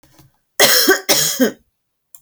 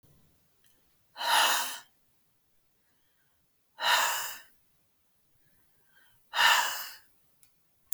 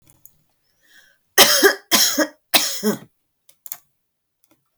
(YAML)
cough_length: 2.2 s
cough_amplitude: 32768
cough_signal_mean_std_ratio: 0.49
exhalation_length: 7.9 s
exhalation_amplitude: 12155
exhalation_signal_mean_std_ratio: 0.35
three_cough_length: 4.8 s
three_cough_amplitude: 32768
three_cough_signal_mean_std_ratio: 0.35
survey_phase: beta (2021-08-13 to 2022-03-07)
age: 18-44
gender: Female
wearing_mask: 'No'
symptom_none: true
smoker_status: Current smoker (1 to 10 cigarettes per day)
respiratory_condition_asthma: false
respiratory_condition_other: false
recruitment_source: REACT
submission_delay: 6 days
covid_test_result: Negative
covid_test_method: RT-qPCR